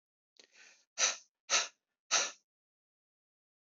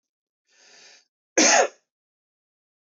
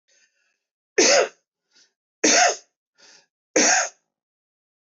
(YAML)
exhalation_length: 3.7 s
exhalation_amplitude: 7305
exhalation_signal_mean_std_ratio: 0.29
cough_length: 2.9 s
cough_amplitude: 17643
cough_signal_mean_std_ratio: 0.27
three_cough_length: 4.9 s
three_cough_amplitude: 17913
three_cough_signal_mean_std_ratio: 0.36
survey_phase: beta (2021-08-13 to 2022-03-07)
age: 45-64
gender: Male
wearing_mask: 'No'
symptom_none: true
smoker_status: Ex-smoker
respiratory_condition_asthma: false
respiratory_condition_other: false
recruitment_source: REACT
submission_delay: 6 days
covid_test_result: Negative
covid_test_method: RT-qPCR